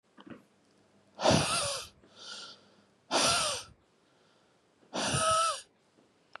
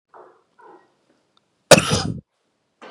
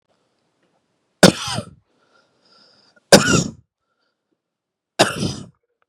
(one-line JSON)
{"exhalation_length": "6.4 s", "exhalation_amplitude": 9588, "exhalation_signal_mean_std_ratio": 0.46, "cough_length": "2.9 s", "cough_amplitude": 32768, "cough_signal_mean_std_ratio": 0.23, "three_cough_length": "5.9 s", "three_cough_amplitude": 32768, "three_cough_signal_mean_std_ratio": 0.25, "survey_phase": "beta (2021-08-13 to 2022-03-07)", "age": "18-44", "gender": "Male", "wearing_mask": "No", "symptom_none": true, "smoker_status": "Current smoker (1 to 10 cigarettes per day)", "respiratory_condition_asthma": true, "respiratory_condition_other": false, "recruitment_source": "REACT", "submission_delay": "5 days", "covid_test_result": "Negative", "covid_test_method": "RT-qPCR", "influenza_a_test_result": "Negative", "influenza_b_test_result": "Negative"}